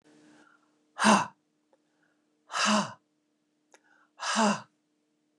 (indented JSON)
{
  "exhalation_length": "5.4 s",
  "exhalation_amplitude": 14023,
  "exhalation_signal_mean_std_ratio": 0.33,
  "survey_phase": "beta (2021-08-13 to 2022-03-07)",
  "age": "65+",
  "gender": "Female",
  "wearing_mask": "No",
  "symptom_none": true,
  "smoker_status": "Ex-smoker",
  "respiratory_condition_asthma": false,
  "respiratory_condition_other": false,
  "recruitment_source": "REACT",
  "submission_delay": "1 day",
  "covid_test_result": "Negative",
  "covid_test_method": "RT-qPCR",
  "influenza_a_test_result": "Unknown/Void",
  "influenza_b_test_result": "Unknown/Void"
}